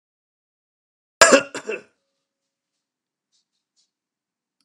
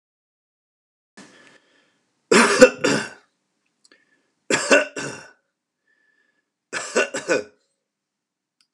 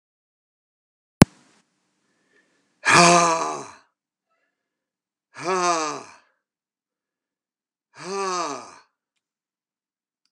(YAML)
cough_length: 4.6 s
cough_amplitude: 32768
cough_signal_mean_std_ratio: 0.17
three_cough_length: 8.7 s
three_cough_amplitude: 32768
three_cough_signal_mean_std_ratio: 0.28
exhalation_length: 10.3 s
exhalation_amplitude: 32768
exhalation_signal_mean_std_ratio: 0.27
survey_phase: beta (2021-08-13 to 2022-03-07)
age: 45-64
gender: Male
wearing_mask: 'No'
symptom_none: true
smoker_status: Never smoked
respiratory_condition_asthma: false
respiratory_condition_other: false
recruitment_source: REACT
submission_delay: 2 days
covid_test_result: Negative
covid_test_method: RT-qPCR